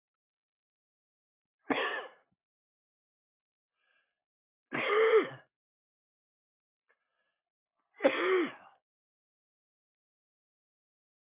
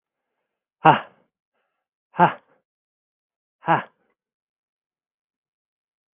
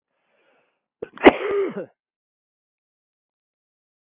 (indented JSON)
{
  "three_cough_length": "11.3 s",
  "three_cough_amplitude": 7963,
  "three_cough_signal_mean_std_ratio": 0.26,
  "exhalation_length": "6.1 s",
  "exhalation_amplitude": 32044,
  "exhalation_signal_mean_std_ratio": 0.18,
  "cough_length": "4.1 s",
  "cough_amplitude": 32687,
  "cough_signal_mean_std_ratio": 0.2,
  "survey_phase": "beta (2021-08-13 to 2022-03-07)",
  "age": "45-64",
  "gender": "Male",
  "wearing_mask": "No",
  "symptom_runny_or_blocked_nose": true,
  "smoker_status": "Never smoked",
  "respiratory_condition_asthma": false,
  "respiratory_condition_other": false,
  "recruitment_source": "Test and Trace",
  "submission_delay": "1 day",
  "covid_test_result": "Positive",
  "covid_test_method": "RT-qPCR",
  "covid_ct_value": 15.2,
  "covid_ct_gene": "N gene",
  "covid_ct_mean": 17.2,
  "covid_viral_load": "2300000 copies/ml",
  "covid_viral_load_category": "High viral load (>1M copies/ml)"
}